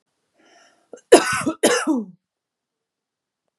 {
  "cough_length": "3.6 s",
  "cough_amplitude": 32768,
  "cough_signal_mean_std_ratio": 0.31,
  "survey_phase": "beta (2021-08-13 to 2022-03-07)",
  "age": "18-44",
  "gender": "Female",
  "wearing_mask": "No",
  "symptom_runny_or_blocked_nose": true,
  "symptom_fatigue": true,
  "symptom_headache": true,
  "symptom_onset": "12 days",
  "smoker_status": "Ex-smoker",
  "respiratory_condition_asthma": false,
  "respiratory_condition_other": false,
  "recruitment_source": "REACT",
  "submission_delay": "1 day",
  "covid_test_result": "Negative",
  "covid_test_method": "RT-qPCR",
  "influenza_a_test_result": "Negative",
  "influenza_b_test_result": "Negative"
}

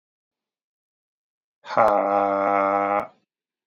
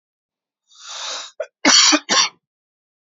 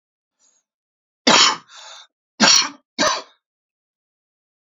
{
  "exhalation_length": "3.7 s",
  "exhalation_amplitude": 20663,
  "exhalation_signal_mean_std_ratio": 0.47,
  "cough_length": "3.1 s",
  "cough_amplitude": 32768,
  "cough_signal_mean_std_ratio": 0.38,
  "three_cough_length": "4.7 s",
  "three_cough_amplitude": 32767,
  "three_cough_signal_mean_std_ratio": 0.32,
  "survey_phase": "beta (2021-08-13 to 2022-03-07)",
  "age": "18-44",
  "gender": "Male",
  "wearing_mask": "No",
  "symptom_none": true,
  "smoker_status": "Never smoked",
  "respiratory_condition_asthma": false,
  "respiratory_condition_other": false,
  "recruitment_source": "REACT",
  "submission_delay": "1 day",
  "covid_test_result": "Negative",
  "covid_test_method": "RT-qPCR"
}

